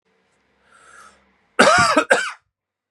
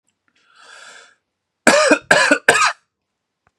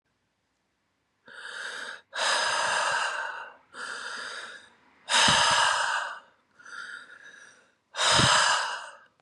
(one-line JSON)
{"cough_length": "2.9 s", "cough_amplitude": 32546, "cough_signal_mean_std_ratio": 0.37, "three_cough_length": "3.6 s", "three_cough_amplitude": 32768, "three_cough_signal_mean_std_ratio": 0.38, "exhalation_length": "9.2 s", "exhalation_amplitude": 13268, "exhalation_signal_mean_std_ratio": 0.55, "survey_phase": "beta (2021-08-13 to 2022-03-07)", "age": "18-44", "gender": "Male", "wearing_mask": "No", "symptom_cough_any": true, "smoker_status": "Ex-smoker", "respiratory_condition_asthma": false, "respiratory_condition_other": false, "recruitment_source": "Test and Trace", "submission_delay": "1 day", "covid_test_method": "RT-qPCR", "covid_ct_value": 34.7, "covid_ct_gene": "ORF1ab gene", "covid_ct_mean": 34.7, "covid_viral_load": "4.3 copies/ml", "covid_viral_load_category": "Minimal viral load (< 10K copies/ml)"}